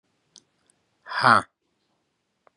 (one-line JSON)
{"exhalation_length": "2.6 s", "exhalation_amplitude": 26725, "exhalation_signal_mean_std_ratio": 0.22, "survey_phase": "beta (2021-08-13 to 2022-03-07)", "age": "45-64", "gender": "Male", "wearing_mask": "No", "symptom_cough_any": true, "symptom_runny_or_blocked_nose": true, "symptom_sore_throat": true, "symptom_fever_high_temperature": true, "symptom_headache": true, "symptom_onset": "3 days", "smoker_status": "Never smoked", "respiratory_condition_asthma": false, "respiratory_condition_other": false, "recruitment_source": "Test and Trace", "submission_delay": "1 day", "covid_test_result": "Negative", "covid_test_method": "ePCR"}